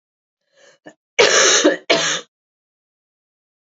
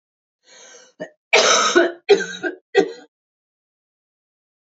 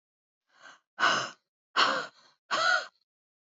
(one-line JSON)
{"cough_length": "3.7 s", "cough_amplitude": 31279, "cough_signal_mean_std_ratio": 0.39, "three_cough_length": "4.6 s", "three_cough_amplitude": 28261, "three_cough_signal_mean_std_ratio": 0.37, "exhalation_length": "3.6 s", "exhalation_amplitude": 10548, "exhalation_signal_mean_std_ratio": 0.41, "survey_phase": "alpha (2021-03-01 to 2021-08-12)", "age": "18-44", "gender": "Female", "wearing_mask": "No", "symptom_cough_any": true, "symptom_shortness_of_breath": true, "symptom_abdominal_pain": true, "symptom_fever_high_temperature": true, "symptom_headache": true, "symptom_onset": "1 day", "smoker_status": "Ex-smoker", "respiratory_condition_asthma": false, "respiratory_condition_other": false, "recruitment_source": "Test and Trace", "submission_delay": "1 day", "covid_test_result": "Positive", "covid_test_method": "RT-qPCR", "covid_ct_value": 15.3, "covid_ct_gene": "N gene", "covid_ct_mean": 15.3, "covid_viral_load": "9400000 copies/ml", "covid_viral_load_category": "High viral load (>1M copies/ml)"}